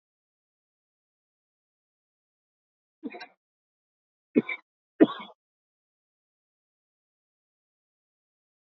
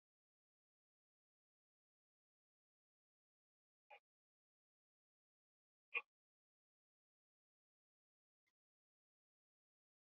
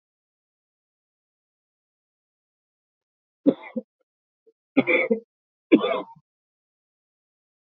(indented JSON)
{
  "cough_length": "8.8 s",
  "cough_amplitude": 20067,
  "cough_signal_mean_std_ratio": 0.11,
  "exhalation_length": "10.2 s",
  "exhalation_amplitude": 927,
  "exhalation_signal_mean_std_ratio": 0.07,
  "three_cough_length": "7.8 s",
  "three_cough_amplitude": 22827,
  "three_cough_signal_mean_std_ratio": 0.22,
  "survey_phase": "beta (2021-08-13 to 2022-03-07)",
  "age": "65+",
  "gender": "Male",
  "wearing_mask": "No",
  "symptom_none": true,
  "smoker_status": "Ex-smoker",
  "respiratory_condition_asthma": false,
  "respiratory_condition_other": false,
  "recruitment_source": "REACT",
  "submission_delay": "1 day",
  "covid_test_result": "Negative",
  "covid_test_method": "RT-qPCR",
  "influenza_a_test_result": "Negative",
  "influenza_b_test_result": "Negative"
}